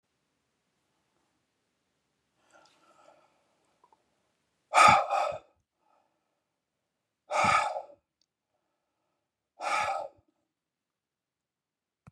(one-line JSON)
{"exhalation_length": "12.1 s", "exhalation_amplitude": 17083, "exhalation_signal_mean_std_ratio": 0.24, "survey_phase": "beta (2021-08-13 to 2022-03-07)", "age": "65+", "gender": "Male", "wearing_mask": "No", "symptom_none": true, "symptom_onset": "2 days", "smoker_status": "Never smoked", "respiratory_condition_asthma": false, "respiratory_condition_other": false, "recruitment_source": "REACT", "submission_delay": "1 day", "covid_test_result": "Negative", "covid_test_method": "RT-qPCR"}